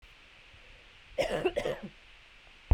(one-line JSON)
{"cough_length": "2.7 s", "cough_amplitude": 8203, "cough_signal_mean_std_ratio": 0.37, "survey_phase": "beta (2021-08-13 to 2022-03-07)", "age": "45-64", "gender": "Female", "wearing_mask": "No", "symptom_none": true, "smoker_status": "Never smoked", "respiratory_condition_asthma": true, "respiratory_condition_other": false, "recruitment_source": "REACT", "submission_delay": "2 days", "covid_test_result": "Negative", "covid_test_method": "RT-qPCR", "influenza_a_test_result": "Negative", "influenza_b_test_result": "Negative"}